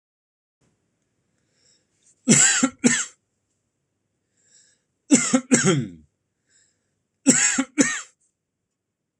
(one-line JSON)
{"three_cough_length": "9.2 s", "three_cough_amplitude": 26027, "three_cough_signal_mean_std_ratio": 0.34, "survey_phase": "alpha (2021-03-01 to 2021-08-12)", "age": "18-44", "gender": "Male", "wearing_mask": "No", "symptom_none": true, "smoker_status": "Never smoked", "respiratory_condition_asthma": true, "respiratory_condition_other": false, "recruitment_source": "REACT", "submission_delay": "2 days", "covid_test_result": "Negative", "covid_test_method": "RT-qPCR"}